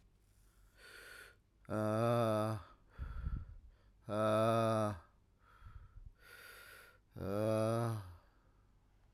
{"exhalation_length": "9.1 s", "exhalation_amplitude": 2631, "exhalation_signal_mean_std_ratio": 0.53, "survey_phase": "beta (2021-08-13 to 2022-03-07)", "age": "45-64", "gender": "Male", "wearing_mask": "Yes", "symptom_cough_any": true, "symptom_new_continuous_cough": true, "symptom_runny_or_blocked_nose": true, "symptom_sore_throat": true, "symptom_abdominal_pain": true, "symptom_fatigue": true, "symptom_fever_high_temperature": true, "symptom_headache": true, "symptom_change_to_sense_of_smell_or_taste": true, "symptom_loss_of_taste": true, "symptom_other": true, "symptom_onset": "3 days", "smoker_status": "Ex-smoker", "respiratory_condition_asthma": true, "respiratory_condition_other": false, "recruitment_source": "Test and Trace", "submission_delay": "2 days", "covid_test_result": "Positive", "covid_test_method": "RT-qPCR", "covid_ct_value": 18.9, "covid_ct_gene": "N gene"}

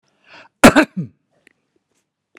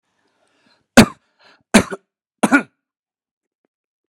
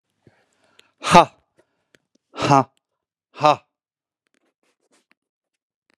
{"cough_length": "2.4 s", "cough_amplitude": 32768, "cough_signal_mean_std_ratio": 0.23, "three_cough_length": "4.1 s", "three_cough_amplitude": 32768, "three_cough_signal_mean_std_ratio": 0.21, "exhalation_length": "6.0 s", "exhalation_amplitude": 32768, "exhalation_signal_mean_std_ratio": 0.2, "survey_phase": "beta (2021-08-13 to 2022-03-07)", "age": "65+", "gender": "Male", "wearing_mask": "No", "symptom_none": true, "smoker_status": "Ex-smoker", "respiratory_condition_asthma": false, "respiratory_condition_other": false, "recruitment_source": "REACT", "submission_delay": "0 days", "covid_test_result": "Negative", "covid_test_method": "RT-qPCR"}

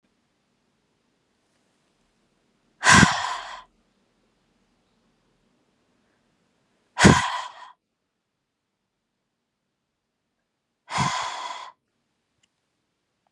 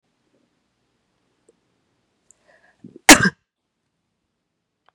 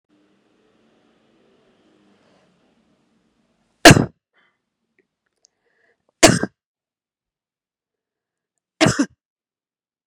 {"exhalation_length": "13.3 s", "exhalation_amplitude": 31976, "exhalation_signal_mean_std_ratio": 0.22, "cough_length": "4.9 s", "cough_amplitude": 32768, "cough_signal_mean_std_ratio": 0.13, "three_cough_length": "10.1 s", "three_cough_amplitude": 32768, "three_cough_signal_mean_std_ratio": 0.16, "survey_phase": "beta (2021-08-13 to 2022-03-07)", "age": "45-64", "gender": "Female", "wearing_mask": "No", "symptom_none": true, "smoker_status": "Never smoked", "respiratory_condition_asthma": false, "respiratory_condition_other": false, "recruitment_source": "Test and Trace", "submission_delay": "2 days", "covid_test_result": "Positive", "covid_test_method": "RT-qPCR", "covid_ct_value": 24.7, "covid_ct_gene": "N gene"}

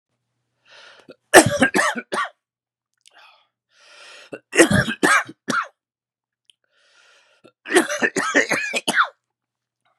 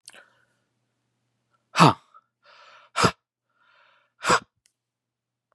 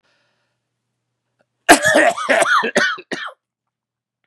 {"three_cough_length": "10.0 s", "three_cough_amplitude": 32768, "three_cough_signal_mean_std_ratio": 0.35, "exhalation_length": "5.5 s", "exhalation_amplitude": 31418, "exhalation_signal_mean_std_ratio": 0.21, "cough_length": "4.3 s", "cough_amplitude": 32768, "cough_signal_mean_std_ratio": 0.41, "survey_phase": "beta (2021-08-13 to 2022-03-07)", "age": "45-64", "gender": "Male", "wearing_mask": "No", "symptom_cough_any": true, "smoker_status": "Never smoked", "respiratory_condition_asthma": false, "respiratory_condition_other": false, "recruitment_source": "Test and Trace", "submission_delay": "1 day", "covid_test_result": "Negative", "covid_test_method": "RT-qPCR"}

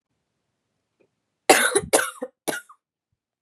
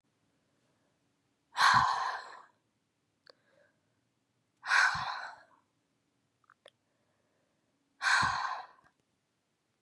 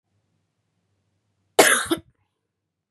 {"three_cough_length": "3.4 s", "three_cough_amplitude": 32767, "three_cough_signal_mean_std_ratio": 0.29, "exhalation_length": "9.8 s", "exhalation_amplitude": 8349, "exhalation_signal_mean_std_ratio": 0.32, "cough_length": "2.9 s", "cough_amplitude": 32644, "cough_signal_mean_std_ratio": 0.24, "survey_phase": "beta (2021-08-13 to 2022-03-07)", "age": "18-44", "gender": "Female", "wearing_mask": "No", "symptom_cough_any": true, "symptom_runny_or_blocked_nose": true, "symptom_sore_throat": true, "symptom_fever_high_temperature": true, "symptom_headache": true, "symptom_onset": "4 days", "smoker_status": "Never smoked", "respiratory_condition_asthma": false, "respiratory_condition_other": false, "recruitment_source": "Test and Trace", "submission_delay": "1 day", "covid_test_result": "Positive", "covid_test_method": "RT-qPCR", "covid_ct_value": 22.2, "covid_ct_gene": "ORF1ab gene"}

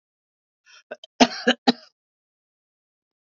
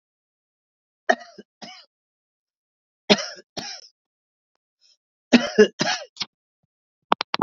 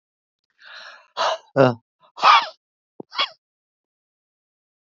{"cough_length": "3.3 s", "cough_amplitude": 27960, "cough_signal_mean_std_ratio": 0.19, "three_cough_length": "7.4 s", "three_cough_amplitude": 32768, "three_cough_signal_mean_std_ratio": 0.21, "exhalation_length": "4.9 s", "exhalation_amplitude": 30181, "exhalation_signal_mean_std_ratio": 0.28, "survey_phase": "beta (2021-08-13 to 2022-03-07)", "age": "65+", "gender": "Female", "wearing_mask": "No", "symptom_cough_any": true, "symptom_shortness_of_breath": true, "symptom_change_to_sense_of_smell_or_taste": true, "smoker_status": "Ex-smoker", "respiratory_condition_asthma": false, "respiratory_condition_other": false, "recruitment_source": "Test and Trace", "submission_delay": "2 days", "covid_test_result": "Negative", "covid_test_method": "RT-qPCR"}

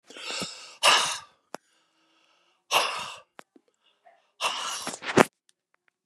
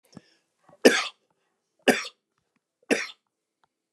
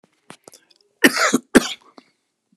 {"exhalation_length": "6.1 s", "exhalation_amplitude": 32767, "exhalation_signal_mean_std_ratio": 0.34, "three_cough_length": "3.9 s", "three_cough_amplitude": 26036, "three_cough_signal_mean_std_ratio": 0.23, "cough_length": "2.6 s", "cough_amplitude": 32768, "cough_signal_mean_std_ratio": 0.28, "survey_phase": "beta (2021-08-13 to 2022-03-07)", "age": "65+", "gender": "Male", "wearing_mask": "No", "symptom_none": true, "smoker_status": "Ex-smoker", "respiratory_condition_asthma": true, "respiratory_condition_other": false, "recruitment_source": "REACT", "submission_delay": "1 day", "covid_test_result": "Negative", "covid_test_method": "RT-qPCR"}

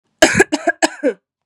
{"three_cough_length": "1.5 s", "three_cough_amplitude": 32768, "three_cough_signal_mean_std_ratio": 0.44, "survey_phase": "beta (2021-08-13 to 2022-03-07)", "age": "18-44", "gender": "Female", "wearing_mask": "No", "symptom_runny_or_blocked_nose": true, "symptom_sore_throat": true, "symptom_onset": "4 days", "smoker_status": "Never smoked", "respiratory_condition_asthma": false, "respiratory_condition_other": false, "recruitment_source": "Test and Trace", "submission_delay": "2 days", "covid_test_result": "Negative", "covid_test_method": "RT-qPCR"}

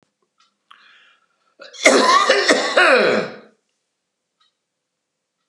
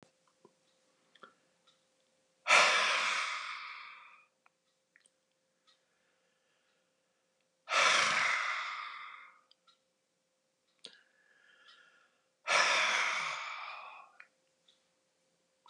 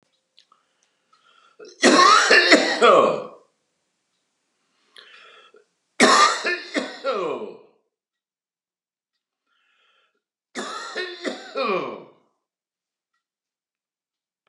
{"cough_length": "5.5 s", "cough_amplitude": 32767, "cough_signal_mean_std_ratio": 0.42, "exhalation_length": "15.7 s", "exhalation_amplitude": 8705, "exhalation_signal_mean_std_ratio": 0.37, "three_cough_length": "14.5 s", "three_cough_amplitude": 31231, "three_cough_signal_mean_std_ratio": 0.35, "survey_phase": "beta (2021-08-13 to 2022-03-07)", "age": "65+", "gender": "Male", "wearing_mask": "No", "symptom_none": true, "smoker_status": "Ex-smoker", "respiratory_condition_asthma": false, "respiratory_condition_other": false, "recruitment_source": "REACT", "submission_delay": "2 days", "covid_test_result": "Negative", "covid_test_method": "RT-qPCR"}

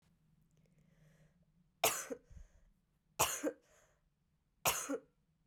{"three_cough_length": "5.5 s", "three_cough_amplitude": 5032, "three_cough_signal_mean_std_ratio": 0.31, "survey_phase": "beta (2021-08-13 to 2022-03-07)", "age": "18-44", "gender": "Female", "wearing_mask": "No", "symptom_cough_any": true, "symptom_runny_or_blocked_nose": true, "symptom_shortness_of_breath": true, "symptom_sore_throat": true, "symptom_fatigue": true, "symptom_fever_high_temperature": true, "symptom_headache": true, "symptom_change_to_sense_of_smell_or_taste": true, "symptom_other": true, "smoker_status": "Ex-smoker", "respiratory_condition_asthma": false, "respiratory_condition_other": false, "recruitment_source": "Test and Trace", "submission_delay": "2 days", "covid_test_result": "Positive", "covid_test_method": "RT-qPCR", "covid_ct_value": 35.5, "covid_ct_gene": "ORF1ab gene"}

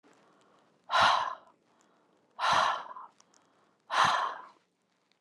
{"exhalation_length": "5.2 s", "exhalation_amplitude": 10060, "exhalation_signal_mean_std_ratio": 0.41, "survey_phase": "alpha (2021-03-01 to 2021-08-12)", "age": "45-64", "gender": "Female", "wearing_mask": "No", "symptom_none": true, "smoker_status": "Never smoked", "respiratory_condition_asthma": false, "respiratory_condition_other": false, "recruitment_source": "REACT", "submission_delay": "2 days", "covid_test_result": "Negative", "covid_test_method": "RT-qPCR"}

